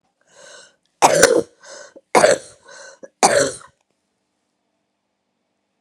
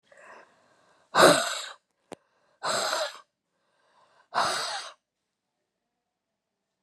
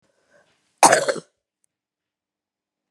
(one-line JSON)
{"three_cough_length": "5.8 s", "three_cough_amplitude": 32768, "three_cough_signal_mean_std_ratio": 0.31, "exhalation_length": "6.8 s", "exhalation_amplitude": 21009, "exhalation_signal_mean_std_ratio": 0.31, "cough_length": "2.9 s", "cough_amplitude": 32768, "cough_signal_mean_std_ratio": 0.22, "survey_phase": "beta (2021-08-13 to 2022-03-07)", "age": "45-64", "gender": "Female", "wearing_mask": "No", "symptom_cough_any": true, "symptom_runny_or_blocked_nose": true, "symptom_fatigue": true, "smoker_status": "Never smoked", "respiratory_condition_asthma": true, "respiratory_condition_other": false, "recruitment_source": "Test and Trace", "submission_delay": "2 days", "covid_test_result": "Positive", "covid_test_method": "RT-qPCR", "covid_ct_value": 20.5, "covid_ct_gene": "ORF1ab gene", "covid_ct_mean": 21.3, "covid_viral_load": "110000 copies/ml", "covid_viral_load_category": "Low viral load (10K-1M copies/ml)"}